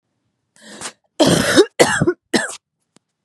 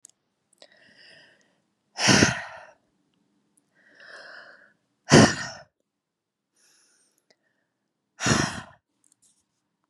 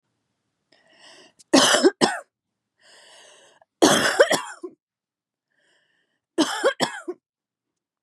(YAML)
cough_length: 3.2 s
cough_amplitude: 32768
cough_signal_mean_std_ratio: 0.42
exhalation_length: 9.9 s
exhalation_amplitude: 25897
exhalation_signal_mean_std_ratio: 0.24
three_cough_length: 8.0 s
three_cough_amplitude: 29583
three_cough_signal_mean_std_ratio: 0.33
survey_phase: beta (2021-08-13 to 2022-03-07)
age: 18-44
gender: Female
wearing_mask: 'No'
symptom_cough_any: true
symptom_new_continuous_cough: true
symptom_runny_or_blocked_nose: true
symptom_shortness_of_breath: true
symptom_sore_throat: true
symptom_abdominal_pain: true
symptom_fatigue: true
symptom_fever_high_temperature: true
symptom_onset: 3 days
smoker_status: Never smoked
respiratory_condition_asthma: false
respiratory_condition_other: false
recruitment_source: Test and Trace
submission_delay: 1 day
covid_test_result: Positive
covid_test_method: RT-qPCR
covid_ct_value: 29.2
covid_ct_gene: N gene
covid_ct_mean: 29.3
covid_viral_load: 240 copies/ml
covid_viral_load_category: Minimal viral load (< 10K copies/ml)